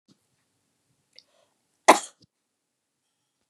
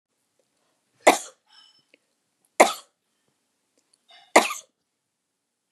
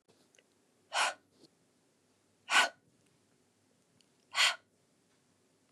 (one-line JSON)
{"cough_length": "3.5 s", "cough_amplitude": 28149, "cough_signal_mean_std_ratio": 0.12, "three_cough_length": "5.7 s", "three_cough_amplitude": 29186, "three_cough_signal_mean_std_ratio": 0.18, "exhalation_length": "5.7 s", "exhalation_amplitude": 8442, "exhalation_signal_mean_std_ratio": 0.25, "survey_phase": "beta (2021-08-13 to 2022-03-07)", "age": "45-64", "gender": "Female", "wearing_mask": "No", "symptom_none": true, "smoker_status": "Never smoked", "respiratory_condition_asthma": false, "respiratory_condition_other": false, "recruitment_source": "REACT", "submission_delay": "1 day", "covid_test_result": "Negative", "covid_test_method": "RT-qPCR", "influenza_a_test_result": "Negative", "influenza_b_test_result": "Negative"}